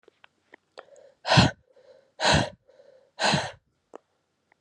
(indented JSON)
{
  "exhalation_length": "4.6 s",
  "exhalation_amplitude": 22202,
  "exhalation_signal_mean_std_ratio": 0.32,
  "survey_phase": "beta (2021-08-13 to 2022-03-07)",
  "age": "18-44",
  "gender": "Female",
  "wearing_mask": "No",
  "symptom_cough_any": true,
  "symptom_new_continuous_cough": true,
  "symptom_runny_or_blocked_nose": true,
  "symptom_shortness_of_breath": true,
  "symptom_sore_throat": true,
  "symptom_headache": true,
  "symptom_other": true,
  "symptom_onset": "2 days",
  "smoker_status": "Current smoker (e-cigarettes or vapes only)",
  "respiratory_condition_asthma": false,
  "respiratory_condition_other": false,
  "recruitment_source": "Test and Trace",
  "submission_delay": "2 days",
  "covid_test_result": "Positive",
  "covid_test_method": "RT-qPCR",
  "covid_ct_value": 16.6,
  "covid_ct_gene": "ORF1ab gene",
  "covid_ct_mean": 17.0,
  "covid_viral_load": "2600000 copies/ml",
  "covid_viral_load_category": "High viral load (>1M copies/ml)"
}